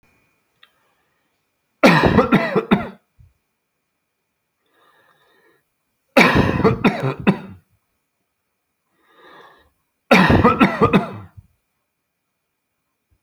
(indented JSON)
{
  "three_cough_length": "13.2 s",
  "three_cough_amplitude": 30361,
  "three_cough_signal_mean_std_ratio": 0.35,
  "survey_phase": "alpha (2021-03-01 to 2021-08-12)",
  "age": "65+",
  "gender": "Male",
  "wearing_mask": "No",
  "symptom_none": true,
  "smoker_status": "Never smoked",
  "respiratory_condition_asthma": false,
  "respiratory_condition_other": false,
  "recruitment_source": "REACT",
  "submission_delay": "3 days",
  "covid_test_result": "Negative",
  "covid_test_method": "RT-qPCR"
}